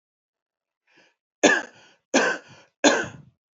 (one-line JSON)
{"three_cough_length": "3.6 s", "three_cough_amplitude": 26461, "three_cough_signal_mean_std_ratio": 0.32, "survey_phase": "alpha (2021-03-01 to 2021-08-12)", "age": "18-44", "gender": "Male", "wearing_mask": "No", "symptom_cough_any": true, "symptom_shortness_of_breath": true, "symptom_fatigue": true, "symptom_headache": true, "smoker_status": "Never smoked", "respiratory_condition_asthma": false, "respiratory_condition_other": false, "recruitment_source": "Test and Trace", "submission_delay": "1 day", "covid_test_result": "Positive", "covid_test_method": "RT-qPCR", "covid_ct_value": 20.3, "covid_ct_gene": "ORF1ab gene", "covid_ct_mean": 21.3, "covid_viral_load": "100000 copies/ml", "covid_viral_load_category": "Low viral load (10K-1M copies/ml)"}